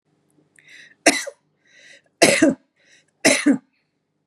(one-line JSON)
{"three_cough_length": "4.3 s", "three_cough_amplitude": 32767, "three_cough_signal_mean_std_ratio": 0.33, "survey_phase": "beta (2021-08-13 to 2022-03-07)", "age": "45-64", "gender": "Female", "wearing_mask": "No", "symptom_none": true, "smoker_status": "Ex-smoker", "respiratory_condition_asthma": true, "respiratory_condition_other": false, "recruitment_source": "REACT", "submission_delay": "1 day", "covid_test_result": "Negative", "covid_test_method": "RT-qPCR", "influenza_a_test_result": "Negative", "influenza_b_test_result": "Negative"}